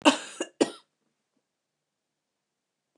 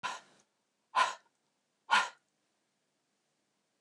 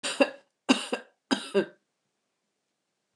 {"cough_length": "3.0 s", "cough_amplitude": 21219, "cough_signal_mean_std_ratio": 0.2, "exhalation_length": "3.8 s", "exhalation_amplitude": 6148, "exhalation_signal_mean_std_ratio": 0.25, "three_cough_length": "3.2 s", "three_cough_amplitude": 15968, "three_cough_signal_mean_std_ratio": 0.3, "survey_phase": "beta (2021-08-13 to 2022-03-07)", "age": "45-64", "gender": "Female", "wearing_mask": "No", "symptom_none": true, "smoker_status": "Never smoked", "respiratory_condition_asthma": false, "respiratory_condition_other": false, "recruitment_source": "Test and Trace", "submission_delay": "3 days", "covid_test_result": "Positive", "covid_test_method": "ePCR"}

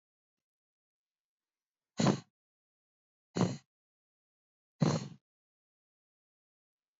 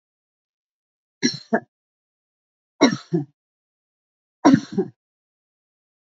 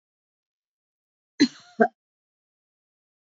{"exhalation_length": "7.0 s", "exhalation_amplitude": 5687, "exhalation_signal_mean_std_ratio": 0.22, "three_cough_length": "6.1 s", "three_cough_amplitude": 27206, "three_cough_signal_mean_std_ratio": 0.24, "cough_length": "3.3 s", "cough_amplitude": 21995, "cough_signal_mean_std_ratio": 0.16, "survey_phase": "beta (2021-08-13 to 2022-03-07)", "age": "65+", "gender": "Female", "wearing_mask": "No", "symptom_none": true, "symptom_onset": "6 days", "smoker_status": "Never smoked", "respiratory_condition_asthma": false, "respiratory_condition_other": false, "recruitment_source": "REACT", "submission_delay": "2 days", "covid_test_result": "Negative", "covid_test_method": "RT-qPCR"}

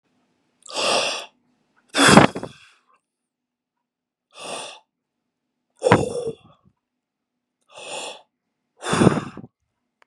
{"exhalation_length": "10.1 s", "exhalation_amplitude": 32768, "exhalation_signal_mean_std_ratio": 0.29, "survey_phase": "beta (2021-08-13 to 2022-03-07)", "age": "45-64", "gender": "Male", "wearing_mask": "No", "symptom_shortness_of_breath": true, "smoker_status": "Never smoked", "respiratory_condition_asthma": true, "respiratory_condition_other": false, "recruitment_source": "REACT", "submission_delay": "6 days", "covid_test_result": "Negative", "covid_test_method": "RT-qPCR", "influenza_a_test_result": "Negative", "influenza_b_test_result": "Negative"}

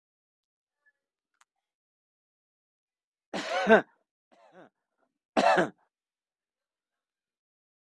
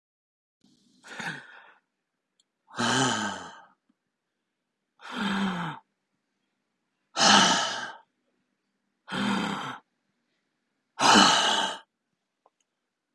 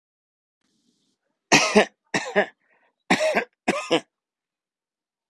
{"three_cough_length": "7.9 s", "three_cough_amplitude": 14903, "three_cough_signal_mean_std_ratio": 0.21, "exhalation_length": "13.1 s", "exhalation_amplitude": 18156, "exhalation_signal_mean_std_ratio": 0.37, "cough_length": "5.3 s", "cough_amplitude": 28338, "cough_signal_mean_std_ratio": 0.32, "survey_phase": "beta (2021-08-13 to 2022-03-07)", "age": "18-44", "gender": "Male", "wearing_mask": "No", "symptom_fatigue": true, "smoker_status": "Never smoked", "respiratory_condition_asthma": false, "respiratory_condition_other": false, "recruitment_source": "REACT", "submission_delay": "3 days", "covid_test_result": "Positive", "covid_test_method": "RT-qPCR", "covid_ct_value": 19.0, "covid_ct_gene": "E gene", "influenza_a_test_result": "Negative", "influenza_b_test_result": "Negative"}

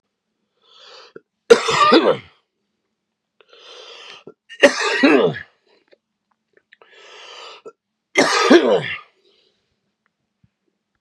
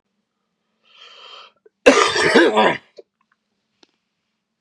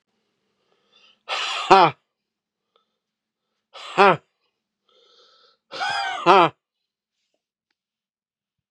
{"three_cough_length": "11.0 s", "three_cough_amplitude": 32768, "three_cough_signal_mean_std_ratio": 0.34, "cough_length": "4.6 s", "cough_amplitude": 32768, "cough_signal_mean_std_ratio": 0.34, "exhalation_length": "8.7 s", "exhalation_amplitude": 32767, "exhalation_signal_mean_std_ratio": 0.25, "survey_phase": "beta (2021-08-13 to 2022-03-07)", "age": "65+", "gender": "Male", "wearing_mask": "No", "symptom_cough_any": true, "symptom_runny_or_blocked_nose": true, "symptom_fatigue": true, "smoker_status": "Ex-smoker", "respiratory_condition_asthma": false, "respiratory_condition_other": false, "recruitment_source": "Test and Trace", "submission_delay": "2 days", "covid_test_result": "Positive", "covid_test_method": "LFT"}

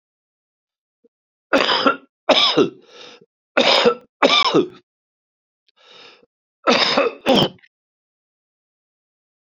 {"three_cough_length": "9.6 s", "three_cough_amplitude": 32767, "three_cough_signal_mean_std_ratio": 0.39, "survey_phase": "beta (2021-08-13 to 2022-03-07)", "age": "65+", "gender": "Male", "wearing_mask": "No", "symptom_shortness_of_breath": true, "symptom_fatigue": true, "smoker_status": "Ex-smoker", "respiratory_condition_asthma": false, "respiratory_condition_other": false, "recruitment_source": "Test and Trace", "submission_delay": "2 days", "covid_test_result": "Positive", "covid_test_method": "LFT"}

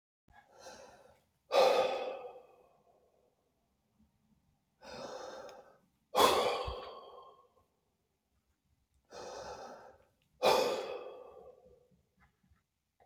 {"exhalation_length": "13.1 s", "exhalation_amplitude": 7950, "exhalation_signal_mean_std_ratio": 0.33, "survey_phase": "beta (2021-08-13 to 2022-03-07)", "age": "45-64", "gender": "Male", "wearing_mask": "No", "symptom_cough_any": true, "smoker_status": "Never smoked", "respiratory_condition_asthma": true, "respiratory_condition_other": false, "recruitment_source": "REACT", "submission_delay": "-1 day", "covid_test_result": "Negative", "covid_test_method": "RT-qPCR", "influenza_a_test_result": "Negative", "influenza_b_test_result": "Negative"}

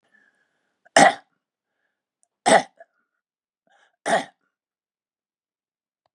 {"three_cough_length": "6.1 s", "three_cough_amplitude": 30785, "three_cough_signal_mean_std_ratio": 0.21, "survey_phase": "beta (2021-08-13 to 2022-03-07)", "age": "65+", "gender": "Male", "wearing_mask": "No", "symptom_cough_any": true, "symptom_runny_or_blocked_nose": true, "symptom_sore_throat": true, "symptom_onset": "4 days", "smoker_status": "Never smoked", "respiratory_condition_asthma": false, "respiratory_condition_other": false, "recruitment_source": "Test and Trace", "submission_delay": "1 day", "covid_test_result": "Positive", "covid_test_method": "RT-qPCR", "covid_ct_value": 23.0, "covid_ct_gene": "N gene"}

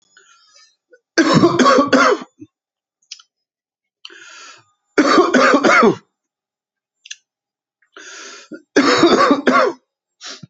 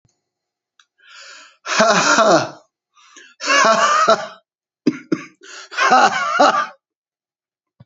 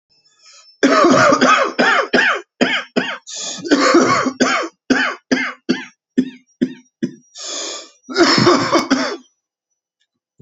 {"three_cough_length": "10.5 s", "three_cough_amplitude": 32767, "three_cough_signal_mean_std_ratio": 0.45, "exhalation_length": "7.9 s", "exhalation_amplitude": 30543, "exhalation_signal_mean_std_ratio": 0.48, "cough_length": "10.4 s", "cough_amplitude": 32768, "cough_signal_mean_std_ratio": 0.58, "survey_phase": "beta (2021-08-13 to 2022-03-07)", "age": "65+", "gender": "Male", "wearing_mask": "No", "symptom_new_continuous_cough": true, "symptom_runny_or_blocked_nose": true, "symptom_sore_throat": true, "symptom_fatigue": true, "symptom_fever_high_temperature": true, "symptom_headache": true, "symptom_loss_of_taste": true, "symptom_other": true, "symptom_onset": "3 days", "smoker_status": "Never smoked", "respiratory_condition_asthma": false, "respiratory_condition_other": false, "recruitment_source": "Test and Trace", "submission_delay": "2 days", "covid_test_result": "Positive", "covid_test_method": "RT-qPCR", "covid_ct_value": 19.6, "covid_ct_gene": "N gene", "covid_ct_mean": 19.9, "covid_viral_load": "290000 copies/ml", "covid_viral_load_category": "Low viral load (10K-1M copies/ml)"}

